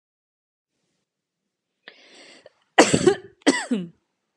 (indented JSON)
{
  "cough_length": "4.4 s",
  "cough_amplitude": 31095,
  "cough_signal_mean_std_ratio": 0.27,
  "survey_phase": "beta (2021-08-13 to 2022-03-07)",
  "age": "45-64",
  "gender": "Female",
  "wearing_mask": "No",
  "symptom_none": true,
  "symptom_onset": "11 days",
  "smoker_status": "Never smoked",
  "respiratory_condition_asthma": false,
  "respiratory_condition_other": false,
  "recruitment_source": "REACT",
  "submission_delay": "6 days",
  "covid_test_result": "Negative",
  "covid_test_method": "RT-qPCR",
  "influenza_a_test_result": "Negative",
  "influenza_b_test_result": "Negative"
}